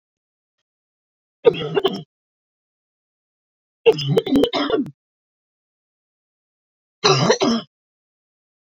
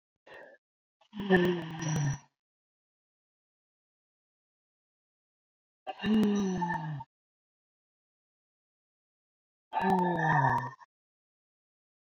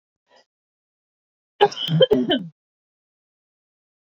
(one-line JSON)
{"three_cough_length": "8.7 s", "three_cough_amplitude": 30307, "three_cough_signal_mean_std_ratio": 0.34, "exhalation_length": "12.1 s", "exhalation_amplitude": 9460, "exhalation_signal_mean_std_ratio": 0.4, "cough_length": "4.0 s", "cough_amplitude": 27408, "cough_signal_mean_std_ratio": 0.3, "survey_phase": "beta (2021-08-13 to 2022-03-07)", "age": "45-64", "gender": "Female", "wearing_mask": "No", "symptom_none": true, "smoker_status": "Never smoked", "respiratory_condition_asthma": false, "respiratory_condition_other": false, "recruitment_source": "REACT", "submission_delay": "1 day", "covid_test_result": "Negative", "covid_test_method": "RT-qPCR"}